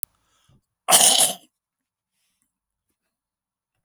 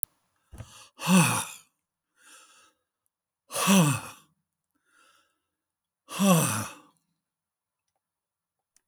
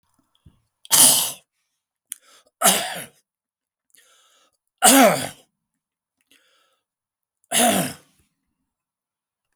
{"cough_length": "3.8 s", "cough_amplitude": 32768, "cough_signal_mean_std_ratio": 0.26, "exhalation_length": "8.9 s", "exhalation_amplitude": 32768, "exhalation_signal_mean_std_ratio": 0.32, "three_cough_length": "9.6 s", "three_cough_amplitude": 32768, "three_cough_signal_mean_std_ratio": 0.3, "survey_phase": "beta (2021-08-13 to 2022-03-07)", "age": "65+", "gender": "Male", "wearing_mask": "No", "symptom_none": true, "symptom_onset": "12 days", "smoker_status": "Never smoked", "respiratory_condition_asthma": false, "respiratory_condition_other": true, "recruitment_source": "REACT", "submission_delay": "2 days", "covid_test_result": "Negative", "covid_test_method": "RT-qPCR", "influenza_a_test_result": "Unknown/Void", "influenza_b_test_result": "Unknown/Void"}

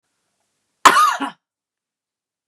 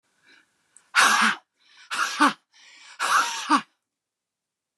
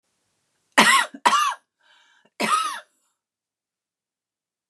{"cough_length": "2.5 s", "cough_amplitude": 32768, "cough_signal_mean_std_ratio": 0.28, "exhalation_length": "4.8 s", "exhalation_amplitude": 19305, "exhalation_signal_mean_std_ratio": 0.41, "three_cough_length": "4.7 s", "three_cough_amplitude": 30935, "three_cough_signal_mean_std_ratio": 0.34, "survey_phase": "beta (2021-08-13 to 2022-03-07)", "age": "45-64", "gender": "Female", "wearing_mask": "No", "symptom_shortness_of_breath": true, "smoker_status": "Never smoked", "respiratory_condition_asthma": false, "respiratory_condition_other": true, "recruitment_source": "REACT", "submission_delay": "1 day", "covid_test_result": "Negative", "covid_test_method": "RT-qPCR", "influenza_a_test_result": "Negative", "influenza_b_test_result": "Negative"}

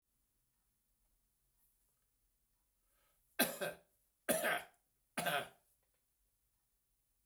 {"three_cough_length": "7.3 s", "three_cough_amplitude": 5017, "three_cough_signal_mean_std_ratio": 0.27, "survey_phase": "beta (2021-08-13 to 2022-03-07)", "age": "65+", "gender": "Male", "wearing_mask": "No", "symptom_cough_any": true, "symptom_runny_or_blocked_nose": true, "symptom_fatigue": true, "symptom_headache": true, "smoker_status": "Never smoked", "respiratory_condition_asthma": false, "respiratory_condition_other": false, "recruitment_source": "Test and Trace", "submission_delay": "2 days", "covid_test_result": "Positive", "covid_test_method": "RT-qPCR", "covid_ct_value": 23.6, "covid_ct_gene": "ORF1ab gene", "covid_ct_mean": 24.5, "covid_viral_load": "9300 copies/ml", "covid_viral_load_category": "Minimal viral load (< 10K copies/ml)"}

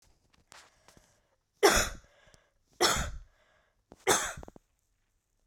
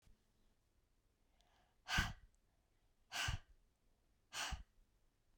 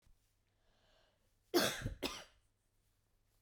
{"three_cough_length": "5.5 s", "three_cough_amplitude": 14394, "three_cough_signal_mean_std_ratio": 0.3, "exhalation_length": "5.4 s", "exhalation_amplitude": 2324, "exhalation_signal_mean_std_ratio": 0.32, "cough_length": "3.4 s", "cough_amplitude": 3228, "cough_signal_mean_std_ratio": 0.29, "survey_phase": "beta (2021-08-13 to 2022-03-07)", "age": "45-64", "gender": "Female", "wearing_mask": "No", "symptom_headache": true, "smoker_status": "Never smoked", "respiratory_condition_asthma": false, "respiratory_condition_other": false, "recruitment_source": "REACT", "submission_delay": "1 day", "covid_test_result": "Negative", "covid_test_method": "RT-qPCR", "influenza_a_test_result": "Unknown/Void", "influenza_b_test_result": "Unknown/Void"}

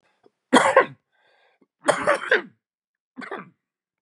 {"three_cough_length": "4.0 s", "three_cough_amplitude": 29638, "three_cough_signal_mean_std_ratio": 0.32, "survey_phase": "beta (2021-08-13 to 2022-03-07)", "age": "45-64", "gender": "Male", "wearing_mask": "No", "symptom_none": true, "smoker_status": "Never smoked", "respiratory_condition_asthma": false, "respiratory_condition_other": false, "recruitment_source": "REACT", "submission_delay": "2 days", "covid_test_result": "Negative", "covid_test_method": "RT-qPCR", "influenza_a_test_result": "Negative", "influenza_b_test_result": "Negative"}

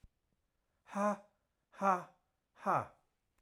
{"exhalation_length": "3.4 s", "exhalation_amplitude": 4010, "exhalation_signal_mean_std_ratio": 0.34, "survey_phase": "alpha (2021-03-01 to 2021-08-12)", "age": "45-64", "gender": "Male", "wearing_mask": "No", "symptom_none": true, "smoker_status": "Never smoked", "respiratory_condition_asthma": true, "respiratory_condition_other": false, "recruitment_source": "REACT", "submission_delay": "1 day", "covid_test_result": "Negative", "covid_test_method": "RT-qPCR"}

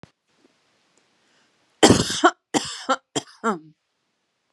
{"three_cough_length": "4.5 s", "three_cough_amplitude": 32767, "three_cough_signal_mean_std_ratio": 0.28, "survey_phase": "beta (2021-08-13 to 2022-03-07)", "age": "18-44", "gender": "Female", "wearing_mask": "No", "symptom_none": true, "smoker_status": "Never smoked", "respiratory_condition_asthma": false, "respiratory_condition_other": false, "recruitment_source": "REACT", "submission_delay": "3 days", "covid_test_result": "Negative", "covid_test_method": "RT-qPCR", "influenza_a_test_result": "Negative", "influenza_b_test_result": "Negative"}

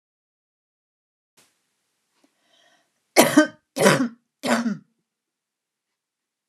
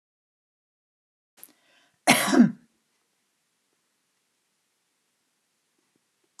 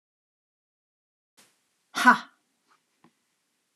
{"three_cough_length": "6.5 s", "three_cough_amplitude": 32767, "three_cough_signal_mean_std_ratio": 0.26, "cough_length": "6.4 s", "cough_amplitude": 31194, "cough_signal_mean_std_ratio": 0.19, "exhalation_length": "3.8 s", "exhalation_amplitude": 21411, "exhalation_signal_mean_std_ratio": 0.16, "survey_phase": "beta (2021-08-13 to 2022-03-07)", "age": "45-64", "gender": "Female", "wearing_mask": "No", "symptom_none": true, "smoker_status": "Never smoked", "respiratory_condition_asthma": false, "respiratory_condition_other": false, "recruitment_source": "REACT", "submission_delay": "1 day", "covid_test_result": "Negative", "covid_test_method": "RT-qPCR"}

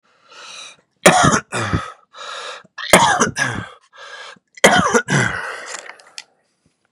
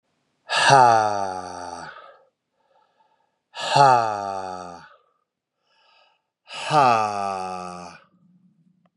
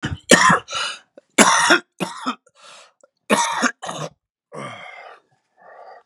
{"three_cough_length": "6.9 s", "three_cough_amplitude": 32768, "three_cough_signal_mean_std_ratio": 0.45, "exhalation_length": "9.0 s", "exhalation_amplitude": 28847, "exhalation_signal_mean_std_ratio": 0.41, "cough_length": "6.1 s", "cough_amplitude": 32768, "cough_signal_mean_std_ratio": 0.41, "survey_phase": "beta (2021-08-13 to 2022-03-07)", "age": "45-64", "gender": "Female", "wearing_mask": "No", "symptom_cough_any": true, "symptom_new_continuous_cough": true, "symptom_shortness_of_breath": true, "symptom_fatigue": true, "symptom_headache": true, "smoker_status": "Ex-smoker", "respiratory_condition_asthma": true, "respiratory_condition_other": false, "recruitment_source": "Test and Trace", "submission_delay": "1 day", "covid_test_result": "Negative", "covid_test_method": "RT-qPCR"}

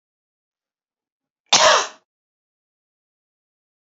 {"cough_length": "3.9 s", "cough_amplitude": 32768, "cough_signal_mean_std_ratio": 0.23, "survey_phase": "beta (2021-08-13 to 2022-03-07)", "age": "18-44", "gender": "Female", "wearing_mask": "No", "symptom_runny_or_blocked_nose": true, "symptom_headache": true, "symptom_onset": "8 days", "smoker_status": "Never smoked", "respiratory_condition_asthma": false, "respiratory_condition_other": false, "recruitment_source": "REACT", "submission_delay": "1 day", "covid_test_result": "Negative", "covid_test_method": "RT-qPCR"}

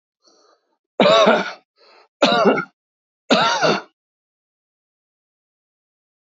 {"three_cough_length": "6.2 s", "three_cough_amplitude": 28519, "three_cough_signal_mean_std_ratio": 0.38, "survey_phase": "alpha (2021-03-01 to 2021-08-12)", "age": "65+", "gender": "Male", "wearing_mask": "No", "symptom_none": true, "smoker_status": "Never smoked", "respiratory_condition_asthma": false, "respiratory_condition_other": false, "recruitment_source": "REACT", "submission_delay": "1 day", "covid_test_result": "Negative", "covid_test_method": "RT-qPCR"}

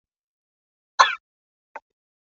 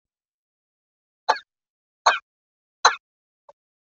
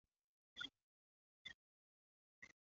{"cough_length": "2.3 s", "cough_amplitude": 32593, "cough_signal_mean_std_ratio": 0.16, "three_cough_length": "4.0 s", "three_cough_amplitude": 32768, "three_cough_signal_mean_std_ratio": 0.18, "exhalation_length": "2.8 s", "exhalation_amplitude": 473, "exhalation_signal_mean_std_ratio": 0.2, "survey_phase": "beta (2021-08-13 to 2022-03-07)", "age": "45-64", "gender": "Female", "wearing_mask": "No", "symptom_cough_any": true, "symptom_runny_or_blocked_nose": true, "symptom_fatigue": true, "smoker_status": "Never smoked", "respiratory_condition_asthma": false, "respiratory_condition_other": false, "recruitment_source": "Test and Trace", "submission_delay": "0 days", "covid_test_result": "Negative", "covid_test_method": "LFT"}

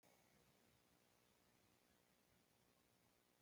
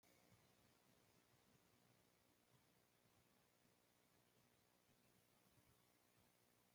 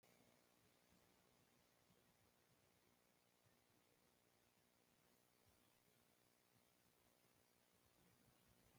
{"cough_length": "3.4 s", "cough_amplitude": 29, "cough_signal_mean_std_ratio": 1.01, "three_cough_length": "6.7 s", "three_cough_amplitude": 30, "three_cough_signal_mean_std_ratio": 1.0, "exhalation_length": "8.8 s", "exhalation_amplitude": 30, "exhalation_signal_mean_std_ratio": 1.01, "survey_phase": "alpha (2021-03-01 to 2021-08-12)", "age": "65+", "gender": "Male", "wearing_mask": "No", "symptom_none": true, "smoker_status": "Never smoked", "respiratory_condition_asthma": false, "respiratory_condition_other": false, "recruitment_source": "REACT", "submission_delay": "2 days", "covid_test_result": "Negative", "covid_test_method": "RT-qPCR"}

